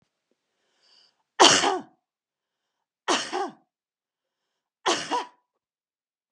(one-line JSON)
{"three_cough_length": "6.3 s", "three_cough_amplitude": 26481, "three_cough_signal_mean_std_ratio": 0.28, "survey_phase": "beta (2021-08-13 to 2022-03-07)", "age": "45-64", "gender": "Female", "wearing_mask": "No", "symptom_none": true, "smoker_status": "Never smoked", "respiratory_condition_asthma": false, "respiratory_condition_other": false, "recruitment_source": "REACT", "submission_delay": "2 days", "covid_test_result": "Negative", "covid_test_method": "RT-qPCR", "influenza_a_test_result": "Negative", "influenza_b_test_result": "Negative"}